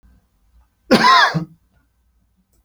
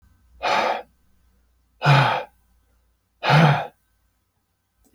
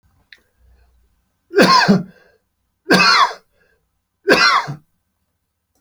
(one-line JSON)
{"cough_length": "2.6 s", "cough_amplitude": 30909, "cough_signal_mean_std_ratio": 0.36, "exhalation_length": "4.9 s", "exhalation_amplitude": 22927, "exhalation_signal_mean_std_ratio": 0.39, "three_cough_length": "5.8 s", "three_cough_amplitude": 32767, "three_cough_signal_mean_std_ratio": 0.4, "survey_phase": "beta (2021-08-13 to 2022-03-07)", "age": "65+", "gender": "Male", "wearing_mask": "No", "symptom_none": true, "smoker_status": "Never smoked", "respiratory_condition_asthma": false, "respiratory_condition_other": false, "recruitment_source": "REACT", "submission_delay": "2 days", "covid_test_result": "Negative", "covid_test_method": "RT-qPCR"}